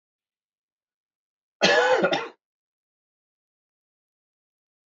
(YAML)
cough_length: 4.9 s
cough_amplitude: 16345
cough_signal_mean_std_ratio: 0.28
survey_phase: beta (2021-08-13 to 2022-03-07)
age: 45-64
gender: Male
wearing_mask: 'No'
symptom_cough_any: true
symptom_runny_or_blocked_nose: true
symptom_sore_throat: true
symptom_diarrhoea: true
symptom_headache: true
symptom_onset: 3 days
smoker_status: Ex-smoker
respiratory_condition_asthma: false
respiratory_condition_other: false
recruitment_source: Test and Trace
submission_delay: 2 days
covid_test_result: Positive
covid_test_method: RT-qPCR
covid_ct_value: 25.2
covid_ct_gene: ORF1ab gene
covid_ct_mean: 25.8
covid_viral_load: 3400 copies/ml
covid_viral_load_category: Minimal viral load (< 10K copies/ml)